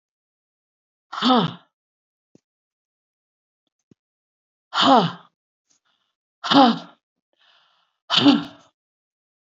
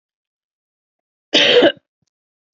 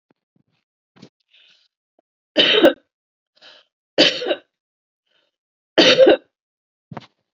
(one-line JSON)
{"exhalation_length": "9.6 s", "exhalation_amplitude": 27828, "exhalation_signal_mean_std_ratio": 0.28, "cough_length": "2.6 s", "cough_amplitude": 32767, "cough_signal_mean_std_ratio": 0.32, "three_cough_length": "7.3 s", "three_cough_amplitude": 32767, "three_cough_signal_mean_std_ratio": 0.3, "survey_phase": "beta (2021-08-13 to 2022-03-07)", "age": "45-64", "gender": "Female", "wearing_mask": "No", "symptom_none": true, "smoker_status": "Ex-smoker", "respiratory_condition_asthma": false, "respiratory_condition_other": false, "recruitment_source": "REACT", "submission_delay": "-1 day", "covid_test_result": "Negative", "covid_test_method": "RT-qPCR", "influenza_a_test_result": "Negative", "influenza_b_test_result": "Negative"}